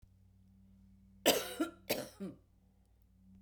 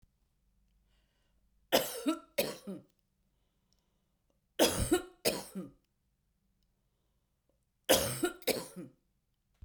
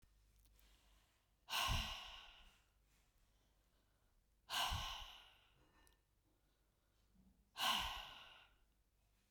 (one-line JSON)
{"cough_length": "3.4 s", "cough_amplitude": 6876, "cough_signal_mean_std_ratio": 0.33, "three_cough_length": "9.6 s", "three_cough_amplitude": 8248, "three_cough_signal_mean_std_ratio": 0.32, "exhalation_length": "9.3 s", "exhalation_amplitude": 1413, "exhalation_signal_mean_std_ratio": 0.37, "survey_phase": "beta (2021-08-13 to 2022-03-07)", "age": "45-64", "gender": "Female", "wearing_mask": "No", "symptom_none": true, "smoker_status": "Never smoked", "respiratory_condition_asthma": false, "respiratory_condition_other": false, "recruitment_source": "REACT", "submission_delay": "6 days", "covid_test_result": "Negative", "covid_test_method": "RT-qPCR"}